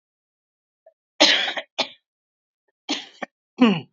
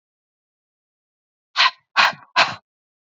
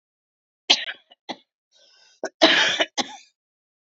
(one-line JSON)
{"three_cough_length": "3.9 s", "three_cough_amplitude": 28771, "three_cough_signal_mean_std_ratio": 0.32, "exhalation_length": "3.1 s", "exhalation_amplitude": 28775, "exhalation_signal_mean_std_ratio": 0.29, "cough_length": "3.9 s", "cough_amplitude": 32768, "cough_signal_mean_std_ratio": 0.31, "survey_phase": "beta (2021-08-13 to 2022-03-07)", "age": "45-64", "gender": "Female", "wearing_mask": "No", "symptom_none": true, "smoker_status": "Ex-smoker", "respiratory_condition_asthma": false, "respiratory_condition_other": false, "recruitment_source": "REACT", "submission_delay": "3 days", "covid_test_result": "Positive", "covid_test_method": "RT-qPCR", "covid_ct_value": 35.1, "covid_ct_gene": "E gene", "influenza_a_test_result": "Negative", "influenza_b_test_result": "Negative"}